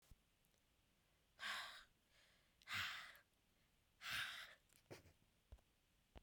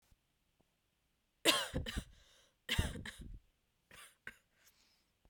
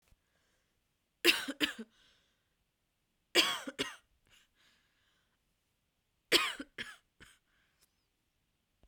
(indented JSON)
{
  "exhalation_length": "6.2 s",
  "exhalation_amplitude": 621,
  "exhalation_signal_mean_std_ratio": 0.42,
  "cough_length": "5.3 s",
  "cough_amplitude": 7748,
  "cough_signal_mean_std_ratio": 0.31,
  "three_cough_length": "8.9 s",
  "three_cough_amplitude": 10477,
  "three_cough_signal_mean_std_ratio": 0.24,
  "survey_phase": "beta (2021-08-13 to 2022-03-07)",
  "age": "18-44",
  "gender": "Female",
  "wearing_mask": "No",
  "symptom_cough_any": true,
  "symptom_new_continuous_cough": true,
  "symptom_runny_or_blocked_nose": true,
  "symptom_sore_throat": true,
  "symptom_fatigue": true,
  "symptom_onset": "4 days",
  "smoker_status": "Never smoked",
  "respiratory_condition_asthma": false,
  "respiratory_condition_other": false,
  "recruitment_source": "Test and Trace",
  "submission_delay": "2 days",
  "covid_test_result": "Positive",
  "covid_test_method": "RT-qPCR",
  "covid_ct_value": 17.8,
  "covid_ct_gene": "N gene"
}